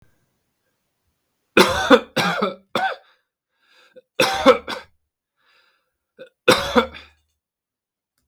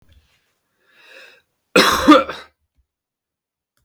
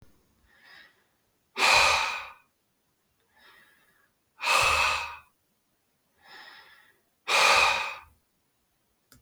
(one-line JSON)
{"three_cough_length": "8.3 s", "three_cough_amplitude": 32768, "three_cough_signal_mean_std_ratio": 0.31, "cough_length": "3.8 s", "cough_amplitude": 32768, "cough_signal_mean_std_ratio": 0.27, "exhalation_length": "9.2 s", "exhalation_amplitude": 13578, "exhalation_signal_mean_std_ratio": 0.38, "survey_phase": "beta (2021-08-13 to 2022-03-07)", "age": "18-44", "gender": "Male", "wearing_mask": "No", "symptom_none": true, "smoker_status": "Never smoked", "respiratory_condition_asthma": false, "respiratory_condition_other": false, "recruitment_source": "REACT", "submission_delay": "1 day", "covid_test_result": "Negative", "covid_test_method": "RT-qPCR", "influenza_a_test_result": "Negative", "influenza_b_test_result": "Negative"}